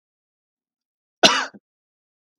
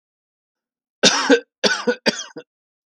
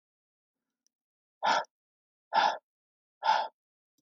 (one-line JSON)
{"cough_length": "2.4 s", "cough_amplitude": 32768, "cough_signal_mean_std_ratio": 0.2, "three_cough_length": "2.9 s", "three_cough_amplitude": 32768, "three_cough_signal_mean_std_ratio": 0.37, "exhalation_length": "4.0 s", "exhalation_amplitude": 6551, "exhalation_signal_mean_std_ratio": 0.32, "survey_phase": "beta (2021-08-13 to 2022-03-07)", "age": "18-44", "gender": "Male", "wearing_mask": "No", "symptom_runny_or_blocked_nose": true, "symptom_fatigue": true, "symptom_headache": true, "symptom_onset": "11 days", "smoker_status": "Current smoker (11 or more cigarettes per day)", "respiratory_condition_asthma": false, "respiratory_condition_other": false, "recruitment_source": "REACT", "submission_delay": "1 day", "covid_test_result": "Negative", "covid_test_method": "RT-qPCR", "influenza_a_test_result": "Negative", "influenza_b_test_result": "Negative"}